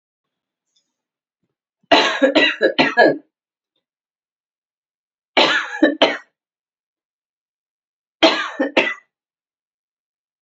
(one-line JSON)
{"three_cough_length": "10.4 s", "three_cough_amplitude": 29962, "three_cough_signal_mean_std_ratio": 0.34, "survey_phase": "beta (2021-08-13 to 2022-03-07)", "age": "18-44", "gender": "Female", "wearing_mask": "No", "symptom_runny_or_blocked_nose": true, "symptom_shortness_of_breath": true, "symptom_sore_throat": true, "symptom_fatigue": true, "symptom_headache": true, "smoker_status": "Ex-smoker", "respiratory_condition_asthma": true, "respiratory_condition_other": false, "recruitment_source": "Test and Trace", "submission_delay": "2 days", "covid_test_result": "Positive", "covid_test_method": "RT-qPCR"}